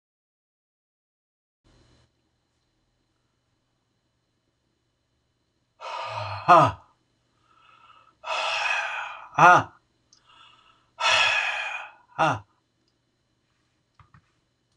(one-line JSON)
{"exhalation_length": "14.8 s", "exhalation_amplitude": 25178, "exhalation_signal_mean_std_ratio": 0.28, "survey_phase": "beta (2021-08-13 to 2022-03-07)", "age": "65+", "gender": "Male", "wearing_mask": "No", "symptom_none": true, "smoker_status": "Never smoked", "respiratory_condition_asthma": false, "respiratory_condition_other": false, "recruitment_source": "REACT", "submission_delay": "1 day", "covid_test_result": "Negative", "covid_test_method": "RT-qPCR"}